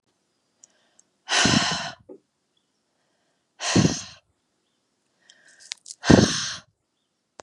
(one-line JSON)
{"exhalation_length": "7.4 s", "exhalation_amplitude": 32533, "exhalation_signal_mean_std_ratio": 0.3, "survey_phase": "beta (2021-08-13 to 2022-03-07)", "age": "45-64", "gender": "Female", "wearing_mask": "No", "symptom_new_continuous_cough": true, "symptom_sore_throat": true, "symptom_diarrhoea": true, "symptom_headache": true, "symptom_loss_of_taste": true, "smoker_status": "Never smoked", "respiratory_condition_asthma": false, "respiratory_condition_other": false, "recruitment_source": "Test and Trace", "submission_delay": "1 day", "covid_test_result": "Positive", "covid_test_method": "LFT"}